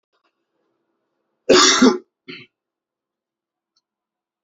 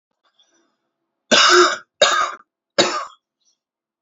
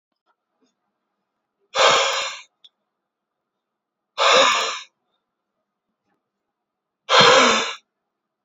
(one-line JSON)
{"cough_length": "4.4 s", "cough_amplitude": 29113, "cough_signal_mean_std_ratio": 0.26, "three_cough_length": "4.0 s", "three_cough_amplitude": 30550, "three_cough_signal_mean_std_ratio": 0.38, "exhalation_length": "8.4 s", "exhalation_amplitude": 32746, "exhalation_signal_mean_std_ratio": 0.35, "survey_phase": "beta (2021-08-13 to 2022-03-07)", "age": "18-44", "gender": "Male", "wearing_mask": "No", "symptom_cough_any": true, "symptom_new_continuous_cough": true, "symptom_runny_or_blocked_nose": true, "symptom_shortness_of_breath": true, "symptom_fatigue": true, "symptom_fever_high_temperature": true, "symptom_change_to_sense_of_smell_or_taste": true, "symptom_loss_of_taste": true, "symptom_onset": "2 days", "smoker_status": "Current smoker (e-cigarettes or vapes only)", "respiratory_condition_asthma": false, "respiratory_condition_other": false, "recruitment_source": "Test and Trace", "submission_delay": "2 days", "covid_test_result": "Positive", "covid_test_method": "RT-qPCR", "covid_ct_value": 19.6, "covid_ct_gene": "ORF1ab gene", "covid_ct_mean": 20.4, "covid_viral_load": "210000 copies/ml", "covid_viral_load_category": "Low viral load (10K-1M copies/ml)"}